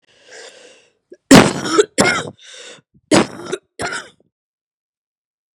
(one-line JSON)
{"cough_length": "5.5 s", "cough_amplitude": 32768, "cough_signal_mean_std_ratio": 0.31, "survey_phase": "beta (2021-08-13 to 2022-03-07)", "age": "18-44", "gender": "Female", "wearing_mask": "No", "symptom_cough_any": true, "symptom_shortness_of_breath": true, "symptom_abdominal_pain": true, "symptom_diarrhoea": true, "symptom_fatigue": true, "symptom_fever_high_temperature": true, "symptom_onset": "3 days", "smoker_status": "Never smoked", "respiratory_condition_asthma": true, "respiratory_condition_other": false, "recruitment_source": "Test and Trace", "submission_delay": "2 days", "covid_test_result": "Positive", "covid_test_method": "RT-qPCR", "covid_ct_value": 17.4, "covid_ct_gene": "ORF1ab gene", "covid_ct_mean": 17.7, "covid_viral_load": "1500000 copies/ml", "covid_viral_load_category": "High viral load (>1M copies/ml)"}